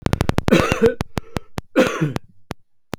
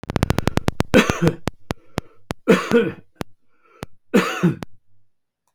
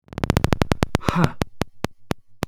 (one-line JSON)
{"cough_length": "3.0 s", "cough_amplitude": 32768, "cough_signal_mean_std_ratio": 0.51, "three_cough_length": "5.5 s", "three_cough_amplitude": 32768, "three_cough_signal_mean_std_ratio": 0.43, "exhalation_length": "2.5 s", "exhalation_amplitude": 32768, "exhalation_signal_mean_std_ratio": 0.46, "survey_phase": "beta (2021-08-13 to 2022-03-07)", "age": "65+", "gender": "Male", "wearing_mask": "No", "symptom_change_to_sense_of_smell_or_taste": true, "symptom_onset": "3 days", "smoker_status": "Never smoked", "respiratory_condition_asthma": false, "respiratory_condition_other": false, "recruitment_source": "Test and Trace", "submission_delay": "2 days", "covid_test_result": "Negative", "covid_test_method": "RT-qPCR"}